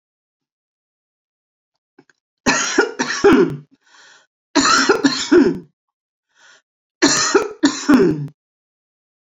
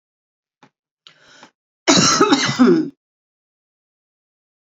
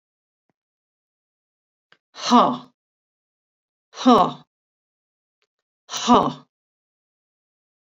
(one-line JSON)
{"three_cough_length": "9.3 s", "three_cough_amplitude": 30769, "three_cough_signal_mean_std_ratio": 0.43, "cough_length": "4.7 s", "cough_amplitude": 32768, "cough_signal_mean_std_ratio": 0.37, "exhalation_length": "7.9 s", "exhalation_amplitude": 26970, "exhalation_signal_mean_std_ratio": 0.25, "survey_phase": "beta (2021-08-13 to 2022-03-07)", "age": "45-64", "gender": "Female", "wearing_mask": "No", "symptom_cough_any": true, "symptom_runny_or_blocked_nose": true, "symptom_shortness_of_breath": true, "symptom_fatigue": true, "symptom_headache": true, "symptom_onset": "5 days", "smoker_status": "Never smoked", "respiratory_condition_asthma": false, "respiratory_condition_other": false, "recruitment_source": "Test and Trace", "submission_delay": "2 days", "covid_test_result": "Positive", "covid_test_method": "RT-qPCR", "covid_ct_value": 17.4, "covid_ct_gene": "N gene", "covid_ct_mean": 18.2, "covid_viral_load": "1100000 copies/ml", "covid_viral_load_category": "High viral load (>1M copies/ml)"}